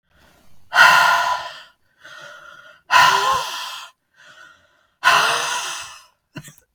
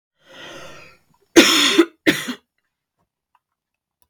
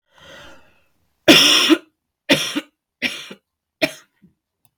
{"exhalation_length": "6.7 s", "exhalation_amplitude": 32768, "exhalation_signal_mean_std_ratio": 0.46, "three_cough_length": "4.1 s", "three_cough_amplitude": 32768, "three_cough_signal_mean_std_ratio": 0.31, "cough_length": "4.8 s", "cough_amplitude": 32768, "cough_signal_mean_std_ratio": 0.34, "survey_phase": "beta (2021-08-13 to 2022-03-07)", "age": "45-64", "gender": "Female", "wearing_mask": "No", "symptom_sore_throat": true, "symptom_fatigue": true, "symptom_change_to_sense_of_smell_or_taste": true, "symptom_loss_of_taste": true, "symptom_other": true, "symptom_onset": "5 days", "smoker_status": "Never smoked", "respiratory_condition_asthma": false, "respiratory_condition_other": false, "recruitment_source": "Test and Trace", "submission_delay": "2 days", "covid_test_result": "Positive", "covid_test_method": "RT-qPCR", "covid_ct_value": 16.6, "covid_ct_gene": "ORF1ab gene"}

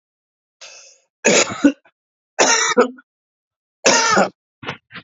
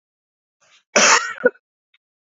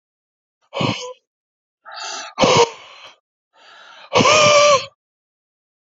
{"three_cough_length": "5.0 s", "three_cough_amplitude": 31492, "three_cough_signal_mean_std_ratio": 0.42, "cough_length": "2.3 s", "cough_amplitude": 30112, "cough_signal_mean_std_ratio": 0.32, "exhalation_length": "5.8 s", "exhalation_amplitude": 29378, "exhalation_signal_mean_std_ratio": 0.4, "survey_phase": "alpha (2021-03-01 to 2021-08-12)", "age": "18-44", "gender": "Male", "wearing_mask": "No", "symptom_fatigue": true, "smoker_status": "Never smoked", "respiratory_condition_asthma": false, "respiratory_condition_other": false, "recruitment_source": "Test and Trace", "submission_delay": "2 days", "covid_test_result": "Positive", "covid_test_method": "RT-qPCR"}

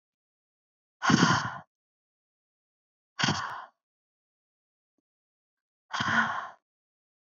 {"exhalation_length": "7.3 s", "exhalation_amplitude": 12841, "exhalation_signal_mean_std_ratio": 0.31, "survey_phase": "beta (2021-08-13 to 2022-03-07)", "age": "18-44", "gender": "Female", "wearing_mask": "No", "symptom_none": true, "smoker_status": "Never smoked", "respiratory_condition_asthma": true, "respiratory_condition_other": false, "recruitment_source": "REACT", "submission_delay": "2 days", "covid_test_result": "Negative", "covid_test_method": "RT-qPCR", "influenza_a_test_result": "Negative", "influenza_b_test_result": "Negative"}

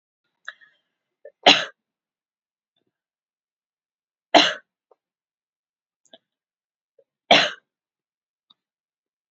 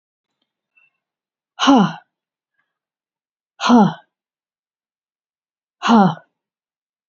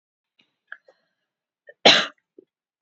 {"three_cough_length": "9.3 s", "three_cough_amplitude": 30821, "three_cough_signal_mean_std_ratio": 0.17, "exhalation_length": "7.1 s", "exhalation_amplitude": 28420, "exhalation_signal_mean_std_ratio": 0.28, "cough_length": "2.8 s", "cough_amplitude": 31672, "cough_signal_mean_std_ratio": 0.2, "survey_phase": "beta (2021-08-13 to 2022-03-07)", "age": "45-64", "gender": "Female", "wearing_mask": "No", "symptom_runny_or_blocked_nose": true, "symptom_sore_throat": true, "symptom_fatigue": true, "symptom_onset": "12 days", "smoker_status": "Never smoked", "respiratory_condition_asthma": false, "respiratory_condition_other": false, "recruitment_source": "REACT", "submission_delay": "1 day", "covid_test_result": "Negative", "covid_test_method": "RT-qPCR", "influenza_a_test_result": "Negative", "influenza_b_test_result": "Negative"}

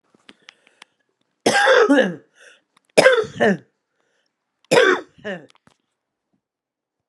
{"three_cough_length": "7.1 s", "three_cough_amplitude": 32768, "three_cough_signal_mean_std_ratio": 0.36, "survey_phase": "alpha (2021-03-01 to 2021-08-12)", "age": "45-64", "gender": "Female", "wearing_mask": "No", "symptom_fatigue": true, "symptom_change_to_sense_of_smell_or_taste": true, "symptom_onset": "2 days", "smoker_status": "Ex-smoker", "respiratory_condition_asthma": false, "respiratory_condition_other": false, "recruitment_source": "Test and Trace", "submission_delay": "1 day", "covid_test_result": "Positive", "covid_test_method": "RT-qPCR", "covid_ct_value": 14.0, "covid_ct_gene": "ORF1ab gene", "covid_ct_mean": 14.3, "covid_viral_load": "20000000 copies/ml", "covid_viral_load_category": "High viral load (>1M copies/ml)"}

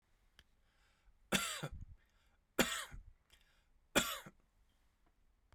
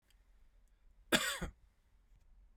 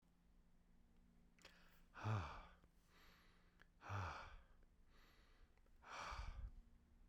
{"three_cough_length": "5.5 s", "three_cough_amplitude": 5528, "three_cough_signal_mean_std_ratio": 0.3, "cough_length": "2.6 s", "cough_amplitude": 5194, "cough_signal_mean_std_ratio": 0.29, "exhalation_length": "7.1 s", "exhalation_amplitude": 652, "exhalation_signal_mean_std_ratio": 0.5, "survey_phase": "beta (2021-08-13 to 2022-03-07)", "age": "45-64", "gender": "Male", "wearing_mask": "No", "symptom_cough_any": true, "symptom_runny_or_blocked_nose": true, "symptom_fatigue": true, "smoker_status": "Never smoked", "respiratory_condition_asthma": false, "respiratory_condition_other": false, "recruitment_source": "Test and Trace", "submission_delay": "1 day", "covid_test_result": "Positive", "covid_test_method": "RT-qPCR", "covid_ct_value": 21.1, "covid_ct_gene": "ORF1ab gene"}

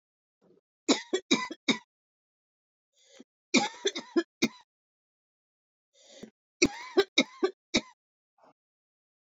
{"three_cough_length": "9.4 s", "three_cough_amplitude": 18093, "three_cough_signal_mean_std_ratio": 0.26, "survey_phase": "beta (2021-08-13 to 2022-03-07)", "age": "45-64", "gender": "Male", "wearing_mask": "No", "symptom_cough_any": true, "symptom_runny_or_blocked_nose": true, "symptom_sore_throat": true, "symptom_fatigue": true, "symptom_headache": true, "symptom_onset": "-1 day", "smoker_status": "Current smoker (1 to 10 cigarettes per day)", "respiratory_condition_asthma": false, "respiratory_condition_other": false, "recruitment_source": "Test and Trace", "submission_delay": "-3 days", "covid_test_result": "Positive", "covid_test_method": "ePCR"}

